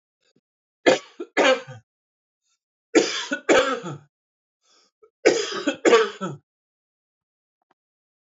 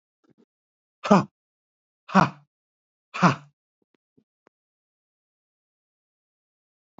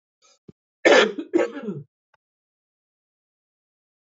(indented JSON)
{
  "three_cough_length": "8.3 s",
  "three_cough_amplitude": 26815,
  "three_cough_signal_mean_std_ratio": 0.35,
  "exhalation_length": "7.0 s",
  "exhalation_amplitude": 26390,
  "exhalation_signal_mean_std_ratio": 0.18,
  "cough_length": "4.2 s",
  "cough_amplitude": 26404,
  "cough_signal_mean_std_ratio": 0.27,
  "survey_phase": "beta (2021-08-13 to 2022-03-07)",
  "age": "45-64",
  "gender": "Male",
  "wearing_mask": "No",
  "symptom_none": true,
  "smoker_status": "Ex-smoker",
  "respiratory_condition_asthma": true,
  "respiratory_condition_other": false,
  "recruitment_source": "REACT",
  "submission_delay": "2 days",
  "covid_test_result": "Negative",
  "covid_test_method": "RT-qPCR"
}